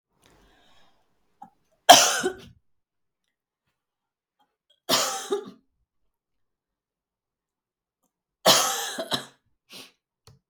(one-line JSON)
{"three_cough_length": "10.5 s", "three_cough_amplitude": 32768, "three_cough_signal_mean_std_ratio": 0.23, "survey_phase": "beta (2021-08-13 to 2022-03-07)", "age": "45-64", "gender": "Female", "wearing_mask": "No", "symptom_runny_or_blocked_nose": true, "smoker_status": "Never smoked", "respiratory_condition_asthma": false, "respiratory_condition_other": false, "recruitment_source": "Test and Trace", "submission_delay": "2 days", "covid_test_result": "Negative", "covid_test_method": "RT-qPCR"}